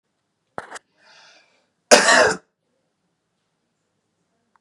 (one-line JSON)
{"cough_length": "4.6 s", "cough_amplitude": 32768, "cough_signal_mean_std_ratio": 0.24, "survey_phase": "beta (2021-08-13 to 2022-03-07)", "age": "18-44", "gender": "Male", "wearing_mask": "No", "symptom_cough_any": true, "smoker_status": "Never smoked", "respiratory_condition_asthma": false, "respiratory_condition_other": false, "recruitment_source": "REACT", "submission_delay": "1 day", "covid_test_result": "Negative", "covid_test_method": "RT-qPCR", "influenza_a_test_result": "Negative", "influenza_b_test_result": "Negative"}